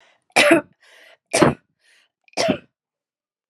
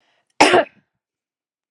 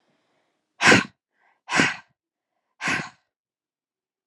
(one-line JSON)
{"three_cough_length": "3.5 s", "three_cough_amplitude": 30879, "three_cough_signal_mean_std_ratio": 0.33, "cough_length": "1.7 s", "cough_amplitude": 32768, "cough_signal_mean_std_ratio": 0.29, "exhalation_length": "4.3 s", "exhalation_amplitude": 27867, "exhalation_signal_mean_std_ratio": 0.28, "survey_phase": "beta (2021-08-13 to 2022-03-07)", "age": "18-44", "gender": "Female", "wearing_mask": "No", "symptom_none": true, "smoker_status": "Never smoked", "respiratory_condition_asthma": false, "respiratory_condition_other": false, "recruitment_source": "REACT", "submission_delay": "1 day", "covid_test_result": "Negative", "covid_test_method": "RT-qPCR", "influenza_a_test_result": "Negative", "influenza_b_test_result": "Negative"}